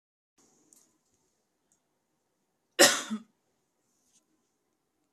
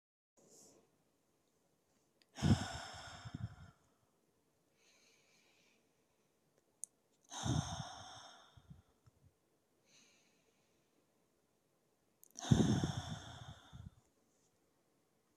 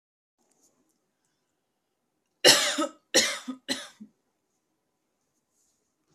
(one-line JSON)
{"cough_length": "5.1 s", "cough_amplitude": 21844, "cough_signal_mean_std_ratio": 0.16, "exhalation_length": "15.4 s", "exhalation_amplitude": 5809, "exhalation_signal_mean_std_ratio": 0.26, "three_cough_length": "6.1 s", "three_cough_amplitude": 24015, "three_cough_signal_mean_std_ratio": 0.24, "survey_phase": "beta (2021-08-13 to 2022-03-07)", "age": "18-44", "gender": "Female", "wearing_mask": "No", "symptom_none": true, "smoker_status": "Ex-smoker", "respiratory_condition_asthma": false, "respiratory_condition_other": false, "recruitment_source": "REACT", "submission_delay": "1 day", "covid_test_result": "Negative", "covid_test_method": "RT-qPCR", "influenza_a_test_result": "Negative", "influenza_b_test_result": "Negative"}